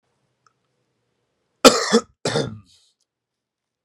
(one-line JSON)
{"cough_length": "3.8 s", "cough_amplitude": 32768, "cough_signal_mean_std_ratio": 0.24, "survey_phase": "beta (2021-08-13 to 2022-03-07)", "age": "18-44", "gender": "Male", "wearing_mask": "No", "symptom_cough_any": true, "symptom_shortness_of_breath": true, "symptom_diarrhoea": true, "symptom_fever_high_temperature": true, "symptom_change_to_sense_of_smell_or_taste": true, "symptom_onset": "4 days", "smoker_status": "Never smoked", "respiratory_condition_asthma": false, "respiratory_condition_other": false, "recruitment_source": "Test and Trace", "submission_delay": "1 day", "covid_test_result": "Positive", "covid_test_method": "RT-qPCR"}